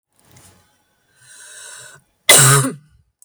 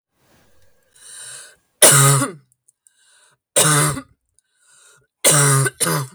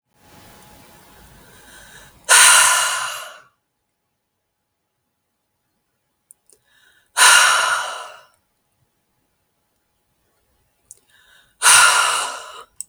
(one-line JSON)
{"cough_length": "3.2 s", "cough_amplitude": 32768, "cough_signal_mean_std_ratio": 0.32, "three_cough_length": "6.1 s", "three_cough_amplitude": 32768, "three_cough_signal_mean_std_ratio": 0.43, "exhalation_length": "12.9 s", "exhalation_amplitude": 32768, "exhalation_signal_mean_std_ratio": 0.33, "survey_phase": "beta (2021-08-13 to 2022-03-07)", "age": "18-44", "gender": "Female", "wearing_mask": "No", "symptom_cough_any": true, "smoker_status": "Ex-smoker", "respiratory_condition_asthma": false, "respiratory_condition_other": false, "recruitment_source": "REACT", "submission_delay": "2 days", "covid_test_result": "Negative", "covid_test_method": "RT-qPCR", "influenza_a_test_result": "Unknown/Void", "influenza_b_test_result": "Unknown/Void"}